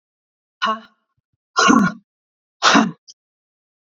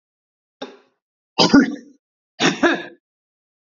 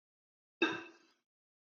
{"exhalation_length": "3.8 s", "exhalation_amplitude": 29026, "exhalation_signal_mean_std_ratio": 0.35, "three_cough_length": "3.7 s", "three_cough_amplitude": 28852, "three_cough_signal_mean_std_ratio": 0.32, "cough_length": "1.6 s", "cough_amplitude": 4430, "cough_signal_mean_std_ratio": 0.25, "survey_phase": "beta (2021-08-13 to 2022-03-07)", "age": "65+", "gender": "Female", "wearing_mask": "No", "symptom_none": true, "smoker_status": "Never smoked", "respiratory_condition_asthma": false, "respiratory_condition_other": false, "recruitment_source": "REACT", "submission_delay": "1 day", "covid_test_result": "Negative", "covid_test_method": "RT-qPCR", "influenza_a_test_result": "Negative", "influenza_b_test_result": "Negative"}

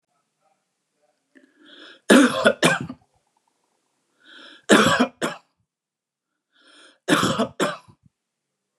{"three_cough_length": "8.8 s", "three_cough_amplitude": 28851, "three_cough_signal_mean_std_ratio": 0.32, "survey_phase": "beta (2021-08-13 to 2022-03-07)", "age": "45-64", "gender": "Male", "wearing_mask": "No", "symptom_none": true, "smoker_status": "Ex-smoker", "respiratory_condition_asthma": true, "respiratory_condition_other": false, "recruitment_source": "REACT", "submission_delay": "5 days", "covid_test_result": "Negative", "covid_test_method": "RT-qPCR", "influenza_a_test_result": "Negative", "influenza_b_test_result": "Negative"}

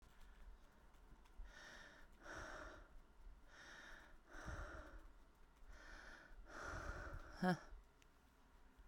{"exhalation_length": "8.9 s", "exhalation_amplitude": 1715, "exhalation_signal_mean_std_ratio": 0.57, "survey_phase": "beta (2021-08-13 to 2022-03-07)", "age": "18-44", "gender": "Female", "wearing_mask": "No", "symptom_cough_any": true, "symptom_runny_or_blocked_nose": true, "symptom_sore_throat": true, "symptom_diarrhoea": true, "symptom_fatigue": true, "symptom_change_to_sense_of_smell_or_taste": true, "symptom_loss_of_taste": true, "smoker_status": "Current smoker (11 or more cigarettes per day)", "respiratory_condition_asthma": false, "respiratory_condition_other": false, "recruitment_source": "Test and Trace", "submission_delay": "1 day", "covid_test_result": "Positive", "covid_test_method": "RT-qPCR"}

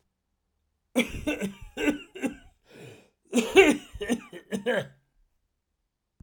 {"cough_length": "6.2 s", "cough_amplitude": 22601, "cough_signal_mean_std_ratio": 0.36, "survey_phase": "alpha (2021-03-01 to 2021-08-12)", "age": "65+", "gender": "Male", "wearing_mask": "No", "symptom_none": true, "smoker_status": "Ex-smoker", "respiratory_condition_asthma": false, "respiratory_condition_other": false, "recruitment_source": "Test and Trace", "submission_delay": "1 day", "covid_test_result": "Positive", "covid_test_method": "RT-qPCR"}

